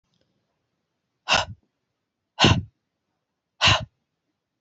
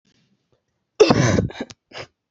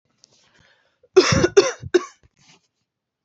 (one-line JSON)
{"exhalation_length": "4.6 s", "exhalation_amplitude": 23904, "exhalation_signal_mean_std_ratio": 0.27, "cough_length": "2.3 s", "cough_amplitude": 30140, "cough_signal_mean_std_ratio": 0.36, "three_cough_length": "3.2 s", "three_cough_amplitude": 28415, "three_cough_signal_mean_std_ratio": 0.3, "survey_phase": "beta (2021-08-13 to 2022-03-07)", "age": "18-44", "gender": "Female", "wearing_mask": "No", "symptom_sore_throat": true, "symptom_fatigue": true, "symptom_other": true, "symptom_onset": "6 days", "smoker_status": "Never smoked", "respiratory_condition_asthma": false, "respiratory_condition_other": false, "recruitment_source": "REACT", "submission_delay": "0 days", "covid_test_result": "Negative", "covid_test_method": "RT-qPCR"}